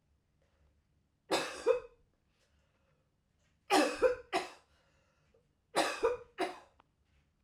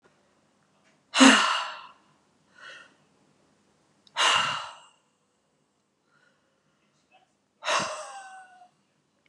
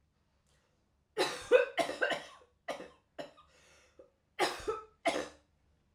{"three_cough_length": "7.4 s", "three_cough_amplitude": 6069, "three_cough_signal_mean_std_ratio": 0.34, "exhalation_length": "9.3 s", "exhalation_amplitude": 24294, "exhalation_signal_mean_std_ratio": 0.27, "cough_length": "5.9 s", "cough_amplitude": 8773, "cough_signal_mean_std_ratio": 0.35, "survey_phase": "alpha (2021-03-01 to 2021-08-12)", "age": "45-64", "gender": "Female", "wearing_mask": "No", "symptom_none": true, "symptom_onset": "13 days", "smoker_status": "Never smoked", "respiratory_condition_asthma": false, "respiratory_condition_other": false, "recruitment_source": "REACT", "submission_delay": "1 day", "covid_test_result": "Negative", "covid_test_method": "RT-qPCR"}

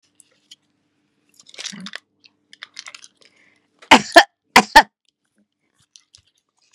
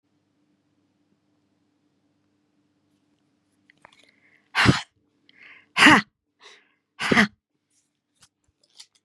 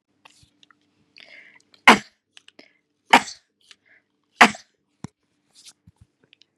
{"cough_length": "6.7 s", "cough_amplitude": 32768, "cough_signal_mean_std_ratio": 0.18, "exhalation_length": "9.0 s", "exhalation_amplitude": 30049, "exhalation_signal_mean_std_ratio": 0.21, "three_cough_length": "6.6 s", "three_cough_amplitude": 32768, "three_cough_signal_mean_std_ratio": 0.16, "survey_phase": "beta (2021-08-13 to 2022-03-07)", "age": "65+", "gender": "Female", "wearing_mask": "No", "symptom_none": true, "smoker_status": "Never smoked", "respiratory_condition_asthma": false, "respiratory_condition_other": false, "recruitment_source": "REACT", "submission_delay": "1 day", "covid_test_result": "Negative", "covid_test_method": "RT-qPCR", "influenza_a_test_result": "Negative", "influenza_b_test_result": "Negative"}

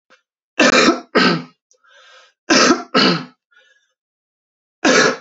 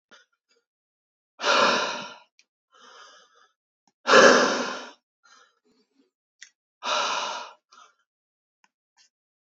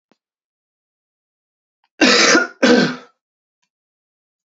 {"three_cough_length": "5.2 s", "three_cough_amplitude": 31641, "three_cough_signal_mean_std_ratio": 0.45, "exhalation_length": "9.6 s", "exhalation_amplitude": 26941, "exhalation_signal_mean_std_ratio": 0.3, "cough_length": "4.5 s", "cough_amplitude": 31424, "cough_signal_mean_std_ratio": 0.34, "survey_phase": "beta (2021-08-13 to 2022-03-07)", "age": "18-44", "gender": "Male", "wearing_mask": "No", "symptom_cough_any": true, "smoker_status": "Ex-smoker", "respiratory_condition_asthma": false, "respiratory_condition_other": false, "recruitment_source": "REACT", "submission_delay": "1 day", "covid_test_result": "Negative", "covid_test_method": "RT-qPCR", "influenza_a_test_result": "Negative", "influenza_b_test_result": "Negative"}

